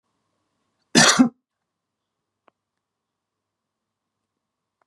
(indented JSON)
{
  "cough_length": "4.9 s",
  "cough_amplitude": 31258,
  "cough_signal_mean_std_ratio": 0.2,
  "survey_phase": "beta (2021-08-13 to 2022-03-07)",
  "age": "65+",
  "gender": "Male",
  "wearing_mask": "No",
  "symptom_none": true,
  "smoker_status": "Never smoked",
  "respiratory_condition_asthma": false,
  "respiratory_condition_other": false,
  "recruitment_source": "REACT",
  "submission_delay": "2 days",
  "covid_test_result": "Negative",
  "covid_test_method": "RT-qPCR",
  "influenza_a_test_result": "Negative",
  "influenza_b_test_result": "Negative"
}